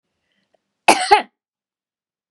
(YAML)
cough_length: 2.3 s
cough_amplitude: 32768
cough_signal_mean_std_ratio: 0.25
survey_phase: beta (2021-08-13 to 2022-03-07)
age: 45-64
gender: Female
wearing_mask: 'No'
symptom_none: true
smoker_status: Never smoked
respiratory_condition_asthma: false
respiratory_condition_other: false
recruitment_source: REACT
submission_delay: 2 days
covid_test_result: Negative
covid_test_method: RT-qPCR